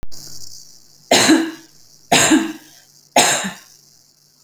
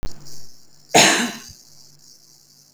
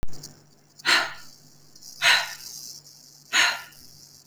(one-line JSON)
{"three_cough_length": "4.4 s", "three_cough_amplitude": 30692, "three_cough_signal_mean_std_ratio": 0.48, "cough_length": "2.7 s", "cough_amplitude": 31197, "cough_signal_mean_std_ratio": 0.43, "exhalation_length": "4.3 s", "exhalation_amplitude": 20304, "exhalation_signal_mean_std_ratio": 0.44, "survey_phase": "beta (2021-08-13 to 2022-03-07)", "age": "45-64", "gender": "Female", "wearing_mask": "No", "symptom_none": true, "smoker_status": "Ex-smoker", "respiratory_condition_asthma": false, "respiratory_condition_other": false, "recruitment_source": "REACT", "submission_delay": "2 days", "covid_test_result": "Negative", "covid_test_method": "RT-qPCR"}